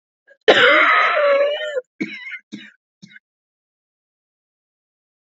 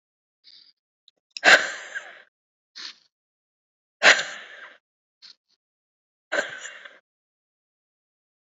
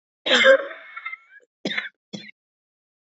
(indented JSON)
{
  "cough_length": "5.2 s",
  "cough_amplitude": 29235,
  "cough_signal_mean_std_ratio": 0.43,
  "exhalation_length": "8.4 s",
  "exhalation_amplitude": 26956,
  "exhalation_signal_mean_std_ratio": 0.21,
  "three_cough_length": "3.2 s",
  "three_cough_amplitude": 23727,
  "three_cough_signal_mean_std_ratio": 0.33,
  "survey_phase": "beta (2021-08-13 to 2022-03-07)",
  "age": "18-44",
  "gender": "Female",
  "wearing_mask": "No",
  "symptom_cough_any": true,
  "symptom_sore_throat": true,
  "symptom_headache": true,
  "symptom_onset": "10 days",
  "smoker_status": "Never smoked",
  "respiratory_condition_asthma": true,
  "respiratory_condition_other": false,
  "recruitment_source": "REACT",
  "submission_delay": "2 days",
  "covid_test_result": "Positive",
  "covid_test_method": "RT-qPCR",
  "covid_ct_value": 27.0,
  "covid_ct_gene": "E gene",
  "influenza_a_test_result": "Negative",
  "influenza_b_test_result": "Negative"
}